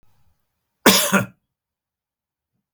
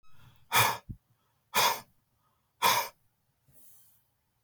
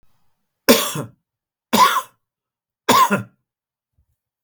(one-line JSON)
{"cough_length": "2.7 s", "cough_amplitude": 32768, "cough_signal_mean_std_ratio": 0.27, "exhalation_length": "4.4 s", "exhalation_amplitude": 9662, "exhalation_signal_mean_std_ratio": 0.34, "three_cough_length": "4.4 s", "three_cough_amplitude": 32768, "three_cough_signal_mean_std_ratio": 0.34, "survey_phase": "beta (2021-08-13 to 2022-03-07)", "age": "45-64", "gender": "Male", "wearing_mask": "No", "symptom_none": true, "symptom_onset": "12 days", "smoker_status": "Never smoked", "respiratory_condition_asthma": false, "respiratory_condition_other": false, "recruitment_source": "REACT", "submission_delay": "1 day", "covid_test_result": "Positive", "covid_test_method": "RT-qPCR", "covid_ct_value": 37.0, "covid_ct_gene": "N gene", "influenza_a_test_result": "Negative", "influenza_b_test_result": "Negative"}